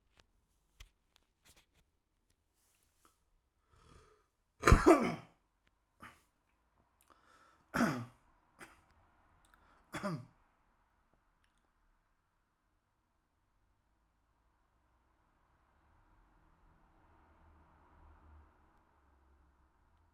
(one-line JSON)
{"cough_length": "20.1 s", "cough_amplitude": 10586, "cough_signal_mean_std_ratio": 0.16, "survey_phase": "alpha (2021-03-01 to 2021-08-12)", "age": "18-44", "gender": "Male", "wearing_mask": "Yes", "symptom_none": true, "smoker_status": "Never smoked", "respiratory_condition_asthma": false, "respiratory_condition_other": false, "recruitment_source": "Test and Trace", "submission_delay": "2 days", "covid_test_result": "Positive", "covid_test_method": "RT-qPCR", "covid_ct_value": 30.0, "covid_ct_gene": "ORF1ab gene", "covid_ct_mean": 30.7, "covid_viral_load": "86 copies/ml", "covid_viral_load_category": "Minimal viral load (< 10K copies/ml)"}